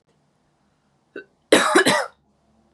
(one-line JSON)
{"cough_length": "2.7 s", "cough_amplitude": 31391, "cough_signal_mean_std_ratio": 0.34, "survey_phase": "beta (2021-08-13 to 2022-03-07)", "age": "18-44", "gender": "Female", "wearing_mask": "No", "symptom_other": true, "smoker_status": "Never smoked", "respiratory_condition_asthma": false, "respiratory_condition_other": false, "recruitment_source": "Test and Trace", "submission_delay": "1 day", "covid_test_result": "Positive", "covid_test_method": "RT-qPCR", "covid_ct_value": 32.2, "covid_ct_gene": "N gene", "covid_ct_mean": 32.3, "covid_viral_load": "26 copies/ml", "covid_viral_load_category": "Minimal viral load (< 10K copies/ml)"}